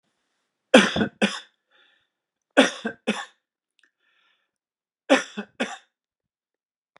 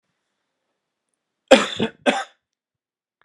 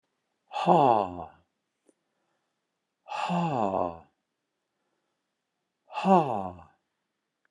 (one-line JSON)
{"three_cough_length": "7.0 s", "three_cough_amplitude": 32445, "three_cough_signal_mean_std_ratio": 0.25, "cough_length": "3.2 s", "cough_amplitude": 32768, "cough_signal_mean_std_ratio": 0.23, "exhalation_length": "7.5 s", "exhalation_amplitude": 14855, "exhalation_signal_mean_std_ratio": 0.35, "survey_phase": "beta (2021-08-13 to 2022-03-07)", "age": "65+", "gender": "Male", "wearing_mask": "No", "symptom_none": true, "smoker_status": "Ex-smoker", "respiratory_condition_asthma": false, "respiratory_condition_other": false, "recruitment_source": "REACT", "submission_delay": "1 day", "covid_test_result": "Negative", "covid_test_method": "RT-qPCR"}